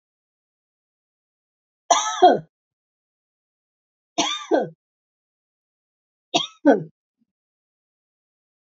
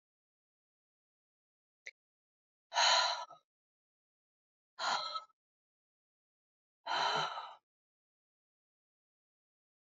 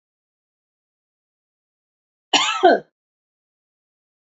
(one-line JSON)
{"three_cough_length": "8.6 s", "three_cough_amplitude": 27222, "three_cough_signal_mean_std_ratio": 0.24, "exhalation_length": "9.8 s", "exhalation_amplitude": 4947, "exhalation_signal_mean_std_ratio": 0.29, "cough_length": "4.4 s", "cough_amplitude": 28274, "cough_signal_mean_std_ratio": 0.22, "survey_phase": "alpha (2021-03-01 to 2021-08-12)", "age": "65+", "gender": "Female", "wearing_mask": "No", "symptom_none": true, "smoker_status": "Never smoked", "respiratory_condition_asthma": false, "respiratory_condition_other": false, "recruitment_source": "REACT", "submission_delay": "1 day", "covid_test_result": "Negative", "covid_test_method": "RT-qPCR"}